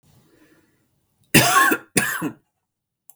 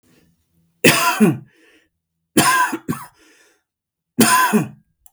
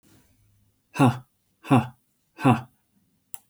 {
  "cough_length": "3.2 s",
  "cough_amplitude": 32768,
  "cough_signal_mean_std_ratio": 0.37,
  "three_cough_length": "5.1 s",
  "three_cough_amplitude": 32768,
  "three_cough_signal_mean_std_ratio": 0.43,
  "exhalation_length": "3.5 s",
  "exhalation_amplitude": 17681,
  "exhalation_signal_mean_std_ratio": 0.3,
  "survey_phase": "beta (2021-08-13 to 2022-03-07)",
  "age": "45-64",
  "gender": "Male",
  "wearing_mask": "No",
  "symptom_none": true,
  "smoker_status": "Never smoked",
  "respiratory_condition_asthma": false,
  "respiratory_condition_other": false,
  "recruitment_source": "REACT",
  "submission_delay": "3 days",
  "covid_test_result": "Negative",
  "covid_test_method": "RT-qPCR",
  "influenza_a_test_result": "Negative",
  "influenza_b_test_result": "Negative"
}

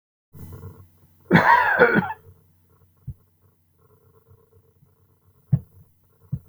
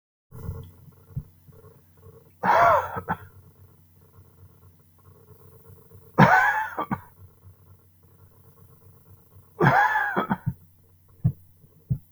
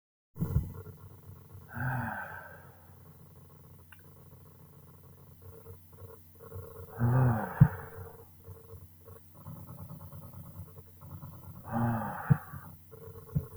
{
  "cough_length": "6.5 s",
  "cough_amplitude": 28296,
  "cough_signal_mean_std_ratio": 0.31,
  "three_cough_length": "12.1 s",
  "three_cough_amplitude": 25793,
  "three_cough_signal_mean_std_ratio": 0.36,
  "exhalation_length": "13.6 s",
  "exhalation_amplitude": 13554,
  "exhalation_signal_mean_std_ratio": 0.4,
  "survey_phase": "beta (2021-08-13 to 2022-03-07)",
  "age": "45-64",
  "gender": "Male",
  "wearing_mask": "No",
  "symptom_none": true,
  "smoker_status": "Ex-smoker",
  "respiratory_condition_asthma": false,
  "respiratory_condition_other": false,
  "recruitment_source": "REACT",
  "submission_delay": "3 days",
  "covid_test_result": "Negative",
  "covid_test_method": "RT-qPCR",
  "influenza_a_test_result": "Negative",
  "influenza_b_test_result": "Negative"
}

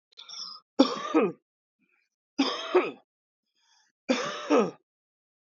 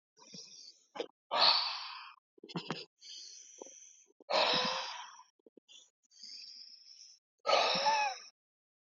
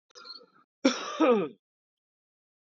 {
  "three_cough_length": "5.5 s",
  "three_cough_amplitude": 20346,
  "three_cough_signal_mean_std_ratio": 0.38,
  "exhalation_length": "8.9 s",
  "exhalation_amplitude": 7019,
  "exhalation_signal_mean_std_ratio": 0.43,
  "cough_length": "2.6 s",
  "cough_amplitude": 13828,
  "cough_signal_mean_std_ratio": 0.35,
  "survey_phase": "beta (2021-08-13 to 2022-03-07)",
  "age": "18-44",
  "gender": "Male",
  "wearing_mask": "No",
  "symptom_cough_any": true,
  "symptom_runny_or_blocked_nose": true,
  "symptom_onset": "3 days",
  "smoker_status": "Never smoked",
  "respiratory_condition_asthma": false,
  "respiratory_condition_other": false,
  "recruitment_source": "Test and Trace",
  "submission_delay": "2 days",
  "covid_test_result": "Positive",
  "covid_test_method": "RT-qPCR",
  "covid_ct_value": 22.7,
  "covid_ct_gene": "N gene"
}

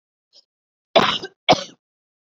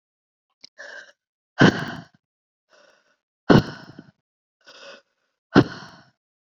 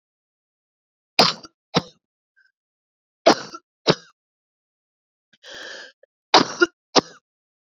{
  "cough_length": "2.3 s",
  "cough_amplitude": 28168,
  "cough_signal_mean_std_ratio": 0.28,
  "exhalation_length": "6.5 s",
  "exhalation_amplitude": 27677,
  "exhalation_signal_mean_std_ratio": 0.22,
  "three_cough_length": "7.7 s",
  "three_cough_amplitude": 31040,
  "three_cough_signal_mean_std_ratio": 0.22,
  "survey_phase": "beta (2021-08-13 to 2022-03-07)",
  "age": "18-44",
  "gender": "Female",
  "wearing_mask": "No",
  "symptom_runny_or_blocked_nose": true,
  "symptom_sore_throat": true,
  "symptom_fatigue": true,
  "symptom_fever_high_temperature": true,
  "symptom_headache": true,
  "symptom_change_to_sense_of_smell_or_taste": true,
  "symptom_loss_of_taste": true,
  "symptom_onset": "3 days",
  "smoker_status": "Never smoked",
  "respiratory_condition_asthma": false,
  "respiratory_condition_other": false,
  "recruitment_source": "Test and Trace",
  "submission_delay": "1 day",
  "covid_test_result": "Positive",
  "covid_test_method": "RT-qPCR",
  "covid_ct_value": 18.7,
  "covid_ct_gene": "N gene",
  "covid_ct_mean": 19.2,
  "covid_viral_load": "500000 copies/ml",
  "covid_viral_load_category": "Low viral load (10K-1M copies/ml)"
}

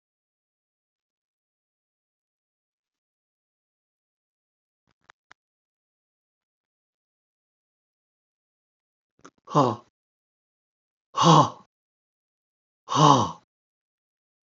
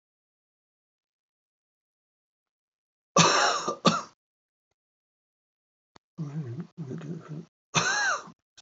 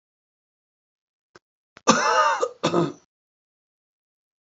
{
  "exhalation_length": "14.5 s",
  "exhalation_amplitude": 25324,
  "exhalation_signal_mean_std_ratio": 0.18,
  "three_cough_length": "8.6 s",
  "three_cough_amplitude": 20177,
  "three_cough_signal_mean_std_ratio": 0.34,
  "cough_length": "4.4 s",
  "cough_amplitude": 29329,
  "cough_signal_mean_std_ratio": 0.34,
  "survey_phase": "beta (2021-08-13 to 2022-03-07)",
  "age": "65+",
  "gender": "Male",
  "wearing_mask": "No",
  "symptom_none": true,
  "smoker_status": "Ex-smoker",
  "respiratory_condition_asthma": false,
  "respiratory_condition_other": false,
  "recruitment_source": "REACT",
  "submission_delay": "1 day",
  "covid_test_result": "Negative",
  "covid_test_method": "RT-qPCR",
  "influenza_a_test_result": "Negative",
  "influenza_b_test_result": "Negative"
}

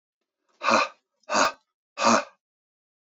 {
  "exhalation_length": "3.2 s",
  "exhalation_amplitude": 17545,
  "exhalation_signal_mean_std_ratio": 0.37,
  "survey_phase": "beta (2021-08-13 to 2022-03-07)",
  "age": "65+",
  "gender": "Male",
  "wearing_mask": "No",
  "symptom_cough_any": true,
  "symptom_sore_throat": true,
  "smoker_status": "Never smoked",
  "respiratory_condition_asthma": false,
  "respiratory_condition_other": false,
  "recruitment_source": "REACT",
  "submission_delay": "1 day",
  "covid_test_result": "Negative",
  "covid_test_method": "RT-qPCR",
  "influenza_a_test_result": "Negative",
  "influenza_b_test_result": "Negative"
}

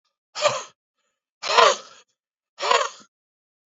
{
  "exhalation_length": "3.7 s",
  "exhalation_amplitude": 26991,
  "exhalation_signal_mean_std_ratio": 0.34,
  "survey_phase": "beta (2021-08-13 to 2022-03-07)",
  "age": "45-64",
  "gender": "Male",
  "wearing_mask": "No",
  "symptom_cough_any": true,
  "smoker_status": "Ex-smoker",
  "respiratory_condition_asthma": false,
  "respiratory_condition_other": false,
  "recruitment_source": "REACT",
  "submission_delay": "1 day",
  "covid_test_result": "Negative",
  "covid_test_method": "RT-qPCR",
  "influenza_a_test_result": "Negative",
  "influenza_b_test_result": "Negative"
}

